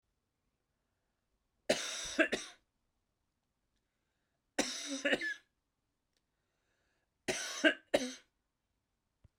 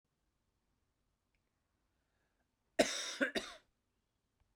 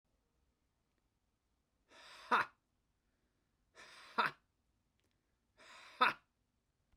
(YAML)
three_cough_length: 9.4 s
three_cough_amplitude: 6213
three_cough_signal_mean_std_ratio: 0.3
cough_length: 4.6 s
cough_amplitude: 5285
cough_signal_mean_std_ratio: 0.23
exhalation_length: 7.0 s
exhalation_amplitude: 4444
exhalation_signal_mean_std_ratio: 0.21
survey_phase: beta (2021-08-13 to 2022-03-07)
age: 45-64
gender: Male
wearing_mask: 'No'
symptom_none: true
smoker_status: Never smoked
respiratory_condition_asthma: false
respiratory_condition_other: false
recruitment_source: REACT
submission_delay: 3 days
covid_test_result: Negative
covid_test_method: RT-qPCR